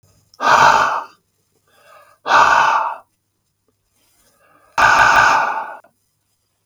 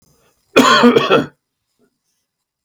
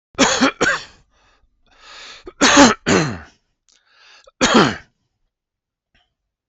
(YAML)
exhalation_length: 6.7 s
exhalation_amplitude: 32768
exhalation_signal_mean_std_ratio: 0.47
cough_length: 2.6 s
cough_amplitude: 32768
cough_signal_mean_std_ratio: 0.41
three_cough_length: 6.5 s
three_cough_amplitude: 32744
three_cough_signal_mean_std_ratio: 0.38
survey_phase: beta (2021-08-13 to 2022-03-07)
age: 45-64
gender: Male
wearing_mask: 'No'
symptom_none: true
smoker_status: Never smoked
respiratory_condition_asthma: true
respiratory_condition_other: false
recruitment_source: REACT
submission_delay: 5 days
covid_test_result: Negative
covid_test_method: RT-qPCR
influenza_a_test_result: Negative
influenza_b_test_result: Negative